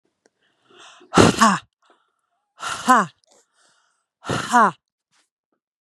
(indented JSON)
{
  "exhalation_length": "5.8 s",
  "exhalation_amplitude": 32768,
  "exhalation_signal_mean_std_ratio": 0.31,
  "survey_phase": "beta (2021-08-13 to 2022-03-07)",
  "age": "18-44",
  "gender": "Female",
  "wearing_mask": "No",
  "symptom_none": true,
  "smoker_status": "Ex-smoker",
  "respiratory_condition_asthma": false,
  "respiratory_condition_other": false,
  "recruitment_source": "REACT",
  "submission_delay": "1 day",
  "covid_test_result": "Negative",
  "covid_test_method": "RT-qPCR",
  "influenza_a_test_result": "Negative",
  "influenza_b_test_result": "Negative"
}